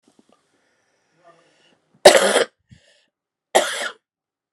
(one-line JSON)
{"cough_length": "4.5 s", "cough_amplitude": 32768, "cough_signal_mean_std_ratio": 0.25, "survey_phase": "beta (2021-08-13 to 2022-03-07)", "age": "18-44", "gender": "Female", "wearing_mask": "No", "symptom_cough_any": true, "symptom_runny_or_blocked_nose": true, "symptom_sore_throat": true, "symptom_abdominal_pain": true, "symptom_diarrhoea": true, "symptom_fatigue": true, "symptom_fever_high_temperature": true, "symptom_loss_of_taste": true, "symptom_onset": "6 days", "smoker_status": "Ex-smoker", "respiratory_condition_asthma": false, "respiratory_condition_other": false, "recruitment_source": "Test and Trace", "submission_delay": "1 day", "covid_test_result": "Positive", "covid_test_method": "RT-qPCR", "covid_ct_value": 16.2, "covid_ct_gene": "N gene", "covid_ct_mean": 16.5, "covid_viral_load": "3900000 copies/ml", "covid_viral_load_category": "High viral load (>1M copies/ml)"}